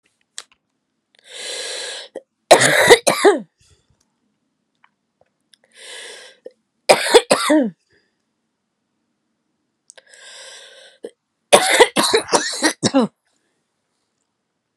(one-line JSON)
{"three_cough_length": "14.8 s", "three_cough_amplitude": 32768, "three_cough_signal_mean_std_ratio": 0.32, "survey_phase": "beta (2021-08-13 to 2022-03-07)", "age": "45-64", "gender": "Female", "wearing_mask": "No", "symptom_new_continuous_cough": true, "symptom_runny_or_blocked_nose": true, "symptom_shortness_of_breath": true, "symptom_sore_throat": true, "symptom_diarrhoea": true, "symptom_fatigue": true, "symptom_onset": "4 days", "smoker_status": "Never smoked", "respiratory_condition_asthma": false, "respiratory_condition_other": false, "recruitment_source": "Test and Trace", "submission_delay": "0 days", "covid_test_result": "Positive", "covid_test_method": "LAMP"}